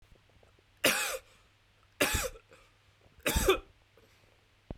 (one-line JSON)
{"three_cough_length": "4.8 s", "three_cough_amplitude": 11377, "three_cough_signal_mean_std_ratio": 0.36, "survey_phase": "beta (2021-08-13 to 2022-03-07)", "age": "18-44", "gender": "Male", "wearing_mask": "No", "symptom_headache": true, "symptom_onset": "13 days", "smoker_status": "Never smoked", "respiratory_condition_asthma": false, "respiratory_condition_other": false, "recruitment_source": "REACT", "submission_delay": "0 days", "covid_test_result": "Negative", "covid_test_method": "RT-qPCR"}